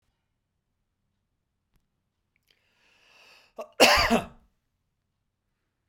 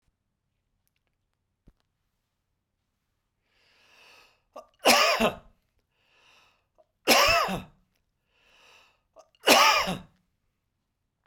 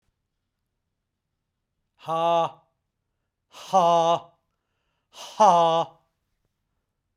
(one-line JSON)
{"cough_length": "5.9 s", "cough_amplitude": 28139, "cough_signal_mean_std_ratio": 0.21, "three_cough_length": "11.3 s", "three_cough_amplitude": 26694, "three_cough_signal_mean_std_ratio": 0.28, "exhalation_length": "7.2 s", "exhalation_amplitude": 19670, "exhalation_signal_mean_std_ratio": 0.35, "survey_phase": "beta (2021-08-13 to 2022-03-07)", "age": "45-64", "gender": "Male", "wearing_mask": "No", "symptom_cough_any": true, "smoker_status": "Ex-smoker", "respiratory_condition_asthma": false, "respiratory_condition_other": false, "recruitment_source": "REACT", "submission_delay": "1 day", "covid_test_result": "Negative", "covid_test_method": "RT-qPCR"}